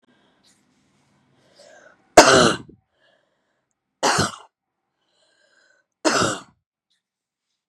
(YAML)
three_cough_length: 7.7 s
three_cough_amplitude: 32768
three_cough_signal_mean_std_ratio: 0.25
survey_phase: beta (2021-08-13 to 2022-03-07)
age: 18-44
gender: Female
wearing_mask: 'No'
symptom_cough_any: true
symptom_shortness_of_breath: true
symptom_sore_throat: true
symptom_fatigue: true
symptom_change_to_sense_of_smell_or_taste: true
symptom_other: true
symptom_onset: 3 days
smoker_status: Never smoked
respiratory_condition_asthma: false
respiratory_condition_other: false
recruitment_source: Test and Trace
submission_delay: 1 day
covid_test_result: Positive
covid_test_method: RT-qPCR
covid_ct_value: 20.8
covid_ct_gene: ORF1ab gene
covid_ct_mean: 21.0
covid_viral_load: 130000 copies/ml
covid_viral_load_category: Low viral load (10K-1M copies/ml)